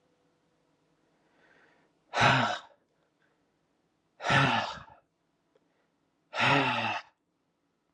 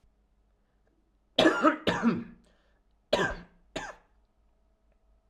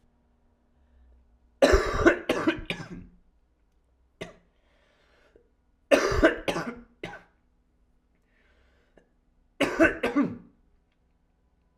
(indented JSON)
{
  "exhalation_length": "7.9 s",
  "exhalation_amplitude": 11005,
  "exhalation_signal_mean_std_ratio": 0.36,
  "cough_length": "5.3 s",
  "cough_amplitude": 17839,
  "cough_signal_mean_std_ratio": 0.33,
  "three_cough_length": "11.8 s",
  "three_cough_amplitude": 19955,
  "three_cough_signal_mean_std_ratio": 0.32,
  "survey_phase": "alpha (2021-03-01 to 2021-08-12)",
  "age": "18-44",
  "gender": "Male",
  "wearing_mask": "No",
  "symptom_cough_any": true,
  "symptom_shortness_of_breath": true,
  "symptom_headache": true,
  "smoker_status": "Never smoked",
  "respiratory_condition_asthma": true,
  "respiratory_condition_other": false,
  "recruitment_source": "Test and Trace",
  "submission_delay": "2 days",
  "covid_test_result": "Positive",
  "covid_test_method": "RT-qPCR"
}